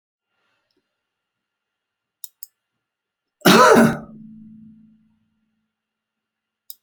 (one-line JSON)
{"cough_length": "6.8 s", "cough_amplitude": 31063, "cough_signal_mean_std_ratio": 0.23, "survey_phase": "alpha (2021-03-01 to 2021-08-12)", "age": "65+", "gender": "Male", "wearing_mask": "No", "symptom_none": true, "smoker_status": "Never smoked", "respiratory_condition_asthma": false, "respiratory_condition_other": false, "recruitment_source": "REACT", "submission_delay": "1 day", "covid_test_result": "Negative", "covid_test_method": "RT-qPCR"}